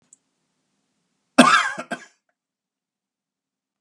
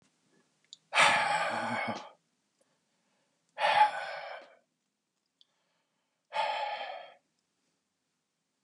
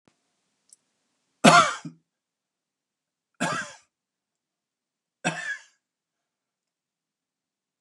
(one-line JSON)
{"cough_length": "3.8 s", "cough_amplitude": 32763, "cough_signal_mean_std_ratio": 0.22, "exhalation_length": "8.6 s", "exhalation_amplitude": 10785, "exhalation_signal_mean_std_ratio": 0.38, "three_cough_length": "7.8 s", "three_cough_amplitude": 27968, "three_cough_signal_mean_std_ratio": 0.2, "survey_phase": "beta (2021-08-13 to 2022-03-07)", "age": "65+", "gender": "Male", "wearing_mask": "No", "symptom_none": true, "smoker_status": "Never smoked", "respiratory_condition_asthma": false, "respiratory_condition_other": false, "recruitment_source": "REACT", "submission_delay": "2 days", "covid_test_result": "Negative", "covid_test_method": "RT-qPCR"}